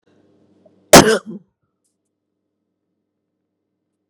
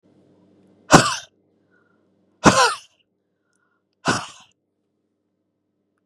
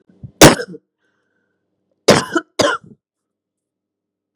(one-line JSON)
{"cough_length": "4.1 s", "cough_amplitude": 32768, "cough_signal_mean_std_ratio": 0.19, "exhalation_length": "6.1 s", "exhalation_amplitude": 32768, "exhalation_signal_mean_std_ratio": 0.24, "three_cough_length": "4.4 s", "three_cough_amplitude": 32768, "three_cough_signal_mean_std_ratio": 0.26, "survey_phase": "beta (2021-08-13 to 2022-03-07)", "age": "45-64", "gender": "Female", "wearing_mask": "No", "symptom_cough_any": true, "symptom_runny_or_blocked_nose": true, "symptom_shortness_of_breath": true, "symptom_sore_throat": true, "symptom_abdominal_pain": true, "symptom_diarrhoea": true, "symptom_fatigue": true, "symptom_change_to_sense_of_smell_or_taste": true, "symptom_loss_of_taste": true, "symptom_other": true, "symptom_onset": "3 days", "smoker_status": "Never smoked", "respiratory_condition_asthma": false, "respiratory_condition_other": false, "recruitment_source": "Test and Trace", "submission_delay": "1 day", "covid_test_result": "Positive", "covid_test_method": "RT-qPCR", "covid_ct_value": 26.0, "covid_ct_gene": "N gene"}